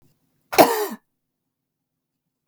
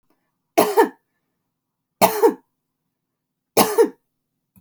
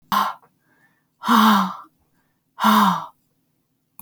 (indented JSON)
{
  "cough_length": "2.5 s",
  "cough_amplitude": 29832,
  "cough_signal_mean_std_ratio": 0.24,
  "three_cough_length": "4.6 s",
  "three_cough_amplitude": 32767,
  "three_cough_signal_mean_std_ratio": 0.32,
  "exhalation_length": "4.0 s",
  "exhalation_amplitude": 25326,
  "exhalation_signal_mean_std_ratio": 0.43,
  "survey_phase": "beta (2021-08-13 to 2022-03-07)",
  "age": "45-64",
  "gender": "Female",
  "wearing_mask": "No",
  "symptom_none": true,
  "smoker_status": "Never smoked",
  "respiratory_condition_asthma": false,
  "respiratory_condition_other": false,
  "recruitment_source": "REACT",
  "submission_delay": "1 day",
  "covid_test_result": "Negative",
  "covid_test_method": "RT-qPCR"
}